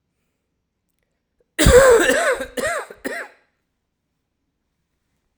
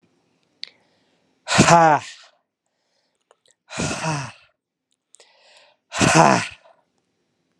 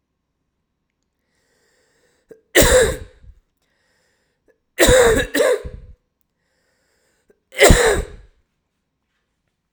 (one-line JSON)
{"cough_length": "5.4 s", "cough_amplitude": 32768, "cough_signal_mean_std_ratio": 0.35, "exhalation_length": "7.6 s", "exhalation_amplitude": 32767, "exhalation_signal_mean_std_ratio": 0.31, "three_cough_length": "9.7 s", "three_cough_amplitude": 32768, "three_cough_signal_mean_std_ratio": 0.33, "survey_phase": "alpha (2021-03-01 to 2021-08-12)", "age": "18-44", "gender": "Male", "wearing_mask": "No", "symptom_cough_any": true, "symptom_change_to_sense_of_smell_or_taste": true, "symptom_loss_of_taste": true, "symptom_onset": "5 days", "smoker_status": "Never smoked", "respiratory_condition_asthma": false, "respiratory_condition_other": false, "recruitment_source": "Test and Trace", "submission_delay": "2 days", "covid_test_result": "Positive", "covid_test_method": "RT-qPCR"}